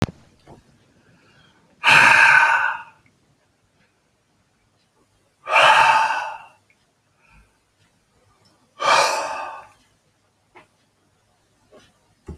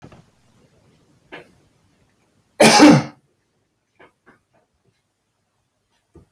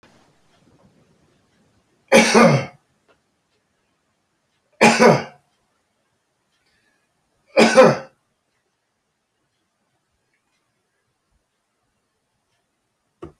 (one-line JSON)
{"exhalation_length": "12.4 s", "exhalation_amplitude": 28593, "exhalation_signal_mean_std_ratio": 0.35, "cough_length": "6.3 s", "cough_amplitude": 31230, "cough_signal_mean_std_ratio": 0.22, "three_cough_length": "13.4 s", "three_cough_amplitude": 32768, "three_cough_signal_mean_std_ratio": 0.24, "survey_phase": "beta (2021-08-13 to 2022-03-07)", "age": "65+", "gender": "Male", "wearing_mask": "No", "symptom_none": true, "smoker_status": "Never smoked", "respiratory_condition_asthma": false, "respiratory_condition_other": false, "recruitment_source": "REACT", "submission_delay": "2 days", "covid_test_result": "Negative", "covid_test_method": "RT-qPCR"}